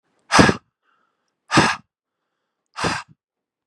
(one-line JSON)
{"exhalation_length": "3.7 s", "exhalation_amplitude": 32768, "exhalation_signal_mean_std_ratio": 0.3, "survey_phase": "beta (2021-08-13 to 2022-03-07)", "age": "18-44", "gender": "Male", "wearing_mask": "No", "symptom_runny_or_blocked_nose": true, "smoker_status": "Never smoked", "respiratory_condition_asthma": false, "respiratory_condition_other": false, "recruitment_source": "REACT", "submission_delay": "1 day", "covid_test_result": "Negative", "covid_test_method": "RT-qPCR", "influenza_a_test_result": "Negative", "influenza_b_test_result": "Negative"}